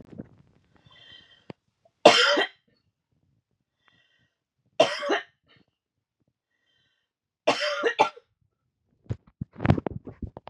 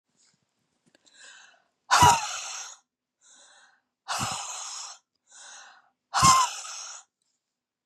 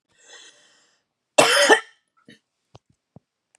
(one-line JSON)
{"three_cough_length": "10.5 s", "three_cough_amplitude": 31222, "three_cough_signal_mean_std_ratio": 0.27, "exhalation_length": "7.9 s", "exhalation_amplitude": 18371, "exhalation_signal_mean_std_ratio": 0.32, "cough_length": "3.6 s", "cough_amplitude": 32723, "cough_signal_mean_std_ratio": 0.27, "survey_phase": "beta (2021-08-13 to 2022-03-07)", "age": "45-64", "gender": "Female", "wearing_mask": "No", "symptom_cough_any": true, "symptom_fatigue": true, "smoker_status": "Never smoked", "respiratory_condition_asthma": false, "respiratory_condition_other": false, "recruitment_source": "REACT", "submission_delay": "2 days", "covid_test_result": "Positive", "covid_test_method": "RT-qPCR", "covid_ct_value": 30.1, "covid_ct_gene": "E gene", "influenza_a_test_result": "Negative", "influenza_b_test_result": "Negative"}